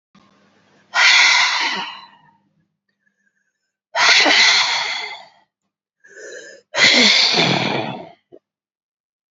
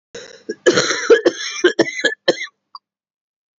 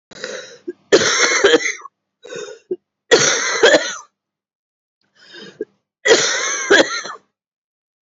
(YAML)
exhalation_length: 9.3 s
exhalation_amplitude: 32767
exhalation_signal_mean_std_ratio: 0.49
cough_length: 3.6 s
cough_amplitude: 32767
cough_signal_mean_std_ratio: 0.43
three_cough_length: 8.0 s
three_cough_amplitude: 30507
three_cough_signal_mean_std_ratio: 0.46
survey_phase: beta (2021-08-13 to 2022-03-07)
age: 18-44
gender: Female
wearing_mask: 'Yes'
symptom_cough_any: true
symptom_runny_or_blocked_nose: true
symptom_shortness_of_breath: true
symptom_fatigue: true
symptom_fever_high_temperature: true
symptom_headache: true
symptom_change_to_sense_of_smell_or_taste: true
symptom_loss_of_taste: true
symptom_onset: 2 days
smoker_status: Current smoker (11 or more cigarettes per day)
respiratory_condition_asthma: true
respiratory_condition_other: false
recruitment_source: Test and Trace
submission_delay: 1 day
covid_test_result: Positive
covid_test_method: RT-qPCR
covid_ct_value: 22.3
covid_ct_gene: ORF1ab gene